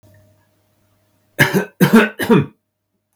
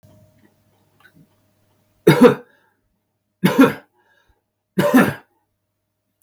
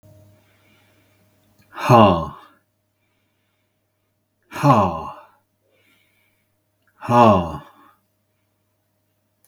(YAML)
cough_length: 3.2 s
cough_amplitude: 32768
cough_signal_mean_std_ratio: 0.37
three_cough_length: 6.2 s
three_cough_amplitude: 32768
three_cough_signal_mean_std_ratio: 0.28
exhalation_length: 9.5 s
exhalation_amplitude: 32768
exhalation_signal_mean_std_ratio: 0.28
survey_phase: beta (2021-08-13 to 2022-03-07)
age: 65+
gender: Male
wearing_mask: 'No'
symptom_none: true
smoker_status: Never smoked
respiratory_condition_asthma: false
respiratory_condition_other: false
recruitment_source: REACT
submission_delay: 2 days
covid_test_result: Negative
covid_test_method: RT-qPCR